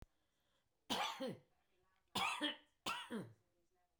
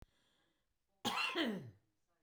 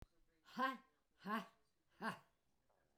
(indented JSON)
{
  "three_cough_length": "4.0 s",
  "three_cough_amplitude": 1499,
  "three_cough_signal_mean_std_ratio": 0.45,
  "cough_length": "2.2 s",
  "cough_amplitude": 2007,
  "cough_signal_mean_std_ratio": 0.44,
  "exhalation_length": "3.0 s",
  "exhalation_amplitude": 1091,
  "exhalation_signal_mean_std_ratio": 0.37,
  "survey_phase": "beta (2021-08-13 to 2022-03-07)",
  "age": "65+",
  "gender": "Female",
  "wearing_mask": "No",
  "symptom_none": true,
  "smoker_status": "Never smoked",
  "respiratory_condition_asthma": false,
  "respiratory_condition_other": false,
  "recruitment_source": "REACT",
  "submission_delay": "16 days",
  "covid_test_result": "Negative",
  "covid_test_method": "RT-qPCR"
}